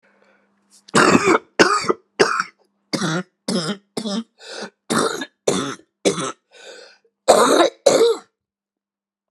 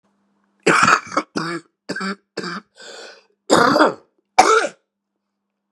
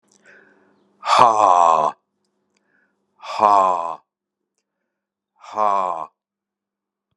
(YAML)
three_cough_length: 9.3 s
three_cough_amplitude: 32768
three_cough_signal_mean_std_ratio: 0.46
cough_length: 5.7 s
cough_amplitude: 32768
cough_signal_mean_std_ratio: 0.41
exhalation_length: 7.2 s
exhalation_amplitude: 32768
exhalation_signal_mean_std_ratio: 0.36
survey_phase: beta (2021-08-13 to 2022-03-07)
age: 65+
gender: Male
wearing_mask: 'No'
symptom_cough_any: true
symptom_runny_or_blocked_nose: true
symptom_sore_throat: true
symptom_fatigue: true
smoker_status: Never smoked
respiratory_condition_asthma: true
respiratory_condition_other: false
recruitment_source: Test and Trace
submission_delay: 2 days
covid_test_result: Positive
covid_test_method: LFT